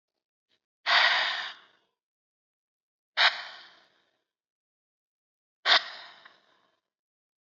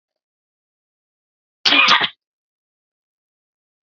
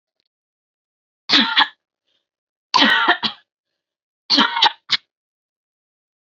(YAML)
exhalation_length: 7.5 s
exhalation_amplitude: 16382
exhalation_signal_mean_std_ratio: 0.28
cough_length: 3.8 s
cough_amplitude: 32767
cough_signal_mean_std_ratio: 0.25
three_cough_length: 6.2 s
three_cough_amplitude: 30011
three_cough_signal_mean_std_ratio: 0.35
survey_phase: beta (2021-08-13 to 2022-03-07)
age: 18-44
gender: Female
wearing_mask: 'No'
symptom_fatigue: true
smoker_status: Never smoked
respiratory_condition_asthma: false
respiratory_condition_other: false
recruitment_source: REACT
submission_delay: 2 days
covid_test_result: Negative
covid_test_method: RT-qPCR
influenza_a_test_result: Negative
influenza_b_test_result: Negative